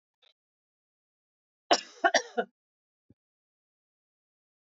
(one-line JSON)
{"cough_length": "4.8 s", "cough_amplitude": 11488, "cough_signal_mean_std_ratio": 0.18, "survey_phase": "alpha (2021-03-01 to 2021-08-12)", "age": "65+", "gender": "Female", "wearing_mask": "No", "symptom_cough_any": true, "smoker_status": "Never smoked", "respiratory_condition_asthma": false, "respiratory_condition_other": false, "recruitment_source": "REACT", "submission_delay": "2 days", "covid_test_result": "Negative", "covid_test_method": "RT-qPCR"}